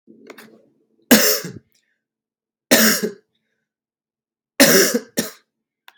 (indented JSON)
{
  "three_cough_length": "6.0 s",
  "three_cough_amplitude": 32768,
  "three_cough_signal_mean_std_ratio": 0.34,
  "survey_phase": "beta (2021-08-13 to 2022-03-07)",
  "age": "18-44",
  "gender": "Male",
  "wearing_mask": "No",
  "symptom_cough_any": true,
  "symptom_fatigue": true,
  "symptom_onset": "4 days",
  "smoker_status": "Ex-smoker",
  "respiratory_condition_asthma": false,
  "respiratory_condition_other": false,
  "recruitment_source": "REACT",
  "submission_delay": "0 days",
  "covid_test_result": "Negative",
  "covid_test_method": "RT-qPCR",
  "influenza_a_test_result": "Negative",
  "influenza_b_test_result": "Negative"
}